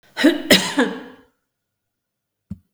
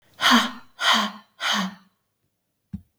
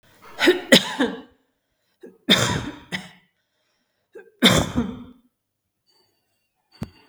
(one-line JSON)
{"cough_length": "2.7 s", "cough_amplitude": 32768, "cough_signal_mean_std_ratio": 0.36, "exhalation_length": "3.0 s", "exhalation_amplitude": 20417, "exhalation_signal_mean_std_ratio": 0.44, "three_cough_length": "7.1 s", "three_cough_amplitude": 32768, "three_cough_signal_mean_std_ratio": 0.33, "survey_phase": "beta (2021-08-13 to 2022-03-07)", "age": "45-64", "gender": "Female", "wearing_mask": "No", "symptom_abdominal_pain": true, "smoker_status": "Never smoked", "respiratory_condition_asthma": false, "respiratory_condition_other": false, "recruitment_source": "REACT", "submission_delay": "1 day", "covid_test_result": "Negative", "covid_test_method": "RT-qPCR", "influenza_a_test_result": "Negative", "influenza_b_test_result": "Negative"}